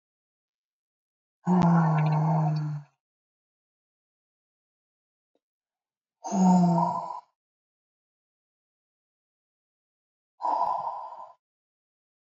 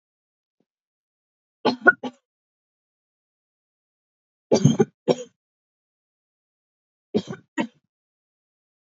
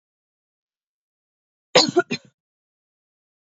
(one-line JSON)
{"exhalation_length": "12.2 s", "exhalation_amplitude": 9756, "exhalation_signal_mean_std_ratio": 0.4, "three_cough_length": "8.9 s", "three_cough_amplitude": 31170, "three_cough_signal_mean_std_ratio": 0.2, "cough_length": "3.6 s", "cough_amplitude": 31296, "cough_signal_mean_std_ratio": 0.19, "survey_phase": "alpha (2021-03-01 to 2021-08-12)", "age": "18-44", "gender": "Female", "wearing_mask": "No", "symptom_none": true, "smoker_status": "Never smoked", "respiratory_condition_asthma": false, "respiratory_condition_other": false, "recruitment_source": "REACT", "submission_delay": "2 days", "covid_test_result": "Negative", "covid_test_method": "RT-qPCR"}